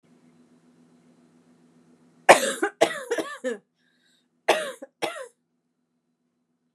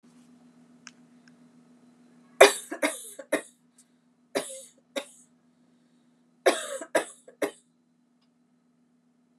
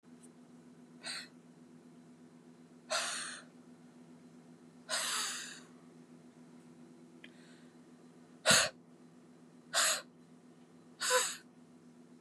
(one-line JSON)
{"cough_length": "6.7 s", "cough_amplitude": 32768, "cough_signal_mean_std_ratio": 0.25, "three_cough_length": "9.4 s", "three_cough_amplitude": 32767, "three_cough_signal_mean_std_ratio": 0.21, "exhalation_length": "12.2 s", "exhalation_amplitude": 8487, "exhalation_signal_mean_std_ratio": 0.38, "survey_phase": "alpha (2021-03-01 to 2021-08-12)", "age": "45-64", "gender": "Female", "wearing_mask": "No", "symptom_none": true, "smoker_status": "Ex-smoker", "recruitment_source": "REACT", "submission_delay": "1 day", "covid_test_result": "Negative", "covid_test_method": "RT-qPCR"}